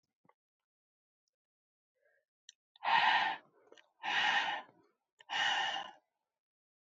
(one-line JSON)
{"exhalation_length": "7.0 s", "exhalation_amplitude": 5384, "exhalation_signal_mean_std_ratio": 0.39, "survey_phase": "alpha (2021-03-01 to 2021-08-12)", "age": "18-44", "gender": "Female", "wearing_mask": "No", "symptom_cough_any": true, "symptom_fatigue": true, "symptom_fever_high_temperature": true, "symptom_headache": true, "symptom_onset": "4 days", "smoker_status": "Never smoked", "respiratory_condition_asthma": false, "respiratory_condition_other": false, "recruitment_source": "Test and Trace", "submission_delay": "2 days", "covid_test_result": "Positive", "covid_test_method": "RT-qPCR", "covid_ct_value": 16.0, "covid_ct_gene": "ORF1ab gene", "covid_ct_mean": 16.6, "covid_viral_load": "3700000 copies/ml", "covid_viral_load_category": "High viral load (>1M copies/ml)"}